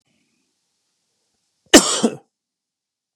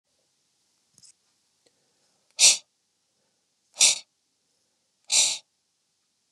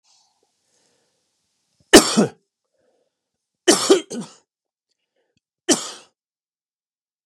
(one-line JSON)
{"cough_length": "3.2 s", "cough_amplitude": 32768, "cough_signal_mean_std_ratio": 0.2, "exhalation_length": "6.3 s", "exhalation_amplitude": 25688, "exhalation_signal_mean_std_ratio": 0.23, "three_cough_length": "7.3 s", "three_cough_amplitude": 32768, "three_cough_signal_mean_std_ratio": 0.22, "survey_phase": "beta (2021-08-13 to 2022-03-07)", "age": "45-64", "gender": "Male", "wearing_mask": "No", "symptom_none": true, "smoker_status": "Never smoked", "respiratory_condition_asthma": false, "respiratory_condition_other": false, "recruitment_source": "REACT", "submission_delay": "4 days", "covid_test_result": "Negative", "covid_test_method": "RT-qPCR", "influenza_a_test_result": "Negative", "influenza_b_test_result": "Negative"}